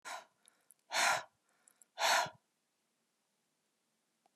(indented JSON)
{
  "exhalation_length": "4.4 s",
  "exhalation_amplitude": 3742,
  "exhalation_signal_mean_std_ratio": 0.31,
  "survey_phase": "beta (2021-08-13 to 2022-03-07)",
  "age": "65+",
  "gender": "Female",
  "wearing_mask": "No",
  "symptom_none": true,
  "smoker_status": "Never smoked",
  "respiratory_condition_asthma": false,
  "respiratory_condition_other": false,
  "recruitment_source": "REACT",
  "submission_delay": "1 day",
  "covid_test_result": "Negative",
  "covid_test_method": "RT-qPCR",
  "influenza_a_test_result": "Negative",
  "influenza_b_test_result": "Negative"
}